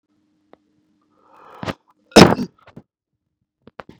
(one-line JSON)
{"cough_length": "4.0 s", "cough_amplitude": 32768, "cough_signal_mean_std_ratio": 0.18, "survey_phase": "beta (2021-08-13 to 2022-03-07)", "age": "18-44", "gender": "Male", "wearing_mask": "No", "symptom_none": true, "smoker_status": "Ex-smoker", "respiratory_condition_asthma": false, "respiratory_condition_other": false, "recruitment_source": "REACT", "submission_delay": "2 days", "covid_test_result": "Negative", "covid_test_method": "RT-qPCR", "influenza_a_test_result": "Negative", "influenza_b_test_result": "Negative"}